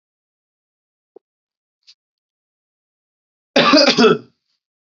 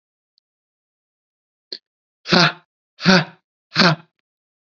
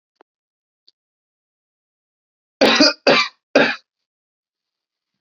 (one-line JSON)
{"cough_length": "4.9 s", "cough_amplitude": 30403, "cough_signal_mean_std_ratio": 0.28, "exhalation_length": "4.7 s", "exhalation_amplitude": 32767, "exhalation_signal_mean_std_ratio": 0.28, "three_cough_length": "5.2 s", "three_cough_amplitude": 31177, "three_cough_signal_mean_std_ratio": 0.28, "survey_phase": "beta (2021-08-13 to 2022-03-07)", "age": "18-44", "gender": "Male", "wearing_mask": "No", "symptom_none": true, "smoker_status": "Never smoked", "respiratory_condition_asthma": false, "respiratory_condition_other": false, "recruitment_source": "REACT", "submission_delay": "2 days", "covid_test_result": "Negative", "covid_test_method": "RT-qPCR", "influenza_a_test_result": "Unknown/Void", "influenza_b_test_result": "Unknown/Void"}